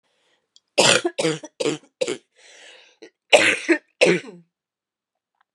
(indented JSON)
{
  "cough_length": "5.5 s",
  "cough_amplitude": 32767,
  "cough_signal_mean_std_ratio": 0.36,
  "survey_phase": "beta (2021-08-13 to 2022-03-07)",
  "age": "18-44",
  "gender": "Female",
  "wearing_mask": "No",
  "symptom_cough_any": true,
  "symptom_sore_throat": true,
  "symptom_abdominal_pain": true,
  "symptom_fatigue": true,
  "symptom_headache": true,
  "symptom_change_to_sense_of_smell_or_taste": true,
  "symptom_loss_of_taste": true,
  "symptom_other": true,
  "symptom_onset": "8 days",
  "smoker_status": "Ex-smoker",
  "respiratory_condition_asthma": false,
  "respiratory_condition_other": false,
  "recruitment_source": "Test and Trace",
  "submission_delay": "2 days",
  "covid_test_result": "Positive",
  "covid_test_method": "RT-qPCR"
}